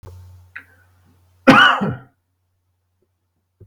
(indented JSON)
{
  "cough_length": "3.7 s",
  "cough_amplitude": 32768,
  "cough_signal_mean_std_ratio": 0.28,
  "survey_phase": "beta (2021-08-13 to 2022-03-07)",
  "age": "45-64",
  "gender": "Male",
  "wearing_mask": "No",
  "symptom_fatigue": true,
  "symptom_onset": "3 days",
  "smoker_status": "Never smoked",
  "respiratory_condition_asthma": true,
  "respiratory_condition_other": false,
  "recruitment_source": "Test and Trace",
  "submission_delay": "1 day",
  "covid_test_result": "Negative",
  "covid_test_method": "ePCR"
}